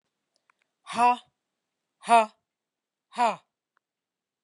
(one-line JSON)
{"exhalation_length": "4.4 s", "exhalation_amplitude": 16323, "exhalation_signal_mean_std_ratio": 0.26, "survey_phase": "beta (2021-08-13 to 2022-03-07)", "age": "45-64", "gender": "Female", "wearing_mask": "No", "symptom_none": true, "smoker_status": "Never smoked", "respiratory_condition_asthma": false, "respiratory_condition_other": false, "recruitment_source": "REACT", "submission_delay": "2 days", "covid_test_result": "Negative", "covid_test_method": "RT-qPCR"}